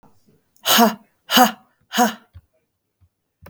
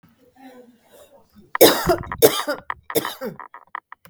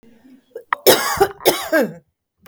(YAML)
exhalation_length: 3.5 s
exhalation_amplitude: 32768
exhalation_signal_mean_std_ratio: 0.34
three_cough_length: 4.1 s
three_cough_amplitude: 32768
three_cough_signal_mean_std_ratio: 0.33
cough_length: 2.5 s
cough_amplitude: 32768
cough_signal_mean_std_ratio: 0.43
survey_phase: beta (2021-08-13 to 2022-03-07)
age: 18-44
gender: Female
wearing_mask: 'No'
symptom_none: true
smoker_status: Never smoked
respiratory_condition_asthma: false
respiratory_condition_other: false
recruitment_source: REACT
submission_delay: 0 days
covid_test_result: Negative
covid_test_method: RT-qPCR
influenza_a_test_result: Negative
influenza_b_test_result: Negative